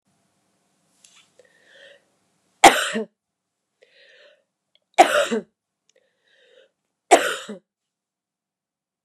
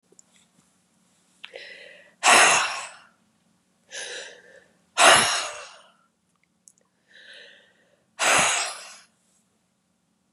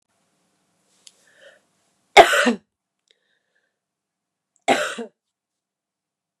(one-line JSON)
{"three_cough_length": "9.0 s", "three_cough_amplitude": 32768, "three_cough_signal_mean_std_ratio": 0.21, "exhalation_length": "10.3 s", "exhalation_amplitude": 27451, "exhalation_signal_mean_std_ratio": 0.32, "cough_length": "6.4 s", "cough_amplitude": 32768, "cough_signal_mean_std_ratio": 0.2, "survey_phase": "beta (2021-08-13 to 2022-03-07)", "age": "65+", "gender": "Female", "wearing_mask": "No", "symptom_none": true, "smoker_status": "Never smoked", "respiratory_condition_asthma": false, "respiratory_condition_other": true, "recruitment_source": "REACT", "submission_delay": "0 days", "covid_test_result": "Negative", "covid_test_method": "RT-qPCR", "influenza_a_test_result": "Negative", "influenza_b_test_result": "Negative"}